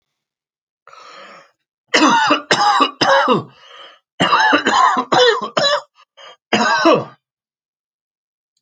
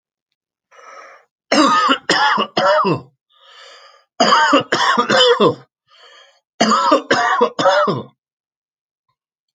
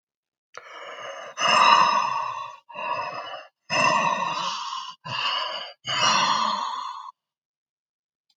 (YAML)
cough_length: 8.6 s
cough_amplitude: 32768
cough_signal_mean_std_ratio: 0.53
three_cough_length: 9.6 s
three_cough_amplitude: 32767
three_cough_signal_mean_std_ratio: 0.55
exhalation_length: 8.4 s
exhalation_amplitude: 26197
exhalation_signal_mean_std_ratio: 0.6
survey_phase: alpha (2021-03-01 to 2021-08-12)
age: 45-64
gender: Male
wearing_mask: 'No'
symptom_cough_any: true
symptom_shortness_of_breath: true
symptom_fatigue: true
symptom_change_to_sense_of_smell_or_taste: true
symptom_loss_of_taste: true
symptom_onset: 3 days
smoker_status: Never smoked
respiratory_condition_asthma: false
respiratory_condition_other: false
recruitment_source: Test and Trace
submission_delay: 2 days
covid_test_result: Positive
covid_test_method: RT-qPCR
covid_ct_value: 16.2
covid_ct_gene: ORF1ab gene
covid_ct_mean: 16.6
covid_viral_load: 3500000 copies/ml
covid_viral_load_category: High viral load (>1M copies/ml)